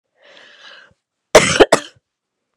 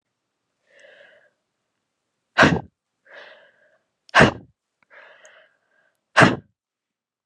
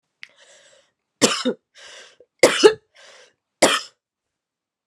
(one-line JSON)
{"cough_length": "2.6 s", "cough_amplitude": 32768, "cough_signal_mean_std_ratio": 0.27, "exhalation_length": "7.3 s", "exhalation_amplitude": 32328, "exhalation_signal_mean_std_ratio": 0.22, "three_cough_length": "4.9 s", "three_cough_amplitude": 32768, "three_cough_signal_mean_std_ratio": 0.27, "survey_phase": "beta (2021-08-13 to 2022-03-07)", "age": "18-44", "gender": "Female", "wearing_mask": "No", "symptom_none": true, "smoker_status": "Never smoked", "respiratory_condition_asthma": true, "respiratory_condition_other": false, "recruitment_source": "REACT", "submission_delay": "3 days", "covid_test_result": "Negative", "covid_test_method": "RT-qPCR", "influenza_a_test_result": "Unknown/Void", "influenza_b_test_result": "Unknown/Void"}